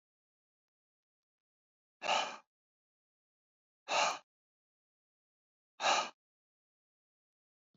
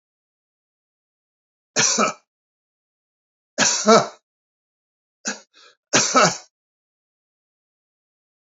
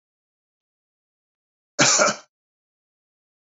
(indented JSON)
{
  "exhalation_length": "7.8 s",
  "exhalation_amplitude": 3922,
  "exhalation_signal_mean_std_ratio": 0.25,
  "three_cough_length": "8.4 s",
  "three_cough_amplitude": 31322,
  "three_cough_signal_mean_std_ratio": 0.29,
  "cough_length": "3.5 s",
  "cough_amplitude": 25299,
  "cough_signal_mean_std_ratio": 0.25,
  "survey_phase": "beta (2021-08-13 to 2022-03-07)",
  "age": "65+",
  "gender": "Male",
  "wearing_mask": "No",
  "symptom_none": true,
  "smoker_status": "Ex-smoker",
  "respiratory_condition_asthma": false,
  "respiratory_condition_other": false,
  "recruitment_source": "REACT",
  "submission_delay": "2 days",
  "covid_test_result": "Negative",
  "covid_test_method": "RT-qPCR",
  "influenza_a_test_result": "Unknown/Void",
  "influenza_b_test_result": "Unknown/Void"
}